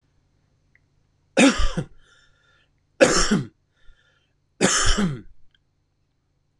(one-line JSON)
{"three_cough_length": "6.6 s", "three_cough_amplitude": 24186, "three_cough_signal_mean_std_ratio": 0.37, "survey_phase": "beta (2021-08-13 to 2022-03-07)", "age": "45-64", "gender": "Male", "wearing_mask": "No", "symptom_cough_any": true, "symptom_onset": "6 days", "smoker_status": "Never smoked", "respiratory_condition_asthma": true, "respiratory_condition_other": false, "recruitment_source": "REACT", "submission_delay": "1 day", "covid_test_result": "Negative", "covid_test_method": "RT-qPCR", "influenza_a_test_result": "Unknown/Void", "influenza_b_test_result": "Unknown/Void"}